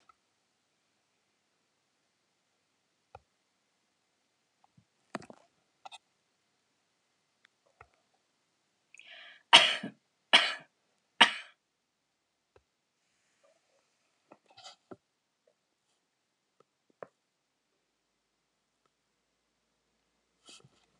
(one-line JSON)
{"three_cough_length": "21.0 s", "three_cough_amplitude": 29598, "three_cough_signal_mean_std_ratio": 0.12, "survey_phase": "alpha (2021-03-01 to 2021-08-12)", "age": "65+", "gender": "Female", "wearing_mask": "No", "symptom_none": true, "smoker_status": "Never smoked", "respiratory_condition_asthma": false, "respiratory_condition_other": false, "recruitment_source": "REACT", "submission_delay": "1 day", "covid_test_result": "Negative", "covid_test_method": "RT-qPCR"}